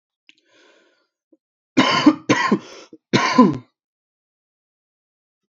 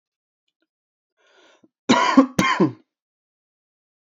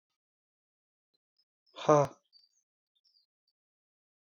{"three_cough_length": "5.5 s", "three_cough_amplitude": 27515, "three_cough_signal_mean_std_ratio": 0.33, "cough_length": "4.0 s", "cough_amplitude": 26675, "cough_signal_mean_std_ratio": 0.31, "exhalation_length": "4.3 s", "exhalation_amplitude": 10330, "exhalation_signal_mean_std_ratio": 0.16, "survey_phase": "alpha (2021-03-01 to 2021-08-12)", "age": "18-44", "gender": "Male", "wearing_mask": "No", "symptom_fatigue": true, "symptom_fever_high_temperature": true, "symptom_headache": true, "smoker_status": "Never smoked", "respiratory_condition_asthma": false, "respiratory_condition_other": false, "recruitment_source": "Test and Trace", "submission_delay": "1 day", "covid_test_result": "Positive", "covid_test_method": "RT-qPCR"}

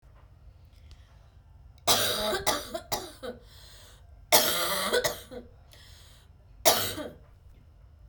{"three_cough_length": "8.1 s", "three_cough_amplitude": 20732, "three_cough_signal_mean_std_ratio": 0.44, "survey_phase": "beta (2021-08-13 to 2022-03-07)", "age": "18-44", "gender": "Male", "wearing_mask": "Yes", "symptom_cough_any": true, "symptom_runny_or_blocked_nose": true, "symptom_sore_throat": true, "symptom_headache": true, "symptom_other": true, "symptom_onset": "8 days", "smoker_status": "Never smoked", "respiratory_condition_asthma": false, "respiratory_condition_other": false, "recruitment_source": "Test and Trace", "submission_delay": "4 days", "covid_test_result": "Positive", "covid_test_method": "RT-qPCR", "covid_ct_value": 22.3, "covid_ct_gene": "ORF1ab gene"}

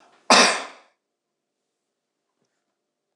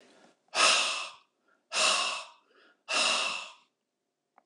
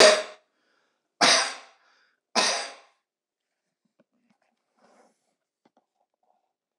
{"cough_length": "3.2 s", "cough_amplitude": 26015, "cough_signal_mean_std_ratio": 0.23, "exhalation_length": "4.5 s", "exhalation_amplitude": 9823, "exhalation_signal_mean_std_ratio": 0.48, "three_cough_length": "6.8 s", "three_cough_amplitude": 24869, "three_cough_signal_mean_std_ratio": 0.25, "survey_phase": "beta (2021-08-13 to 2022-03-07)", "age": "65+", "gender": "Male", "wearing_mask": "No", "symptom_none": true, "smoker_status": "Never smoked", "respiratory_condition_asthma": false, "respiratory_condition_other": false, "recruitment_source": "REACT", "submission_delay": "1 day", "covid_test_result": "Negative", "covid_test_method": "RT-qPCR", "influenza_a_test_result": "Negative", "influenza_b_test_result": "Negative"}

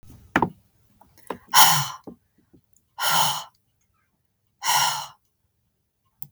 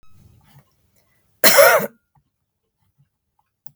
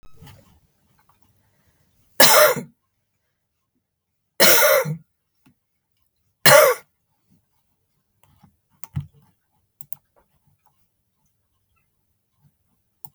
{"exhalation_length": "6.3 s", "exhalation_amplitude": 32766, "exhalation_signal_mean_std_ratio": 0.34, "cough_length": "3.8 s", "cough_amplitude": 32768, "cough_signal_mean_std_ratio": 0.27, "three_cough_length": "13.1 s", "three_cough_amplitude": 32768, "three_cough_signal_mean_std_ratio": 0.25, "survey_phase": "beta (2021-08-13 to 2022-03-07)", "age": "45-64", "gender": "Female", "wearing_mask": "No", "symptom_cough_any": true, "smoker_status": "Ex-smoker", "respiratory_condition_asthma": false, "respiratory_condition_other": false, "recruitment_source": "REACT", "submission_delay": "1 day", "covid_test_result": "Negative", "covid_test_method": "RT-qPCR", "influenza_a_test_result": "Negative", "influenza_b_test_result": "Negative"}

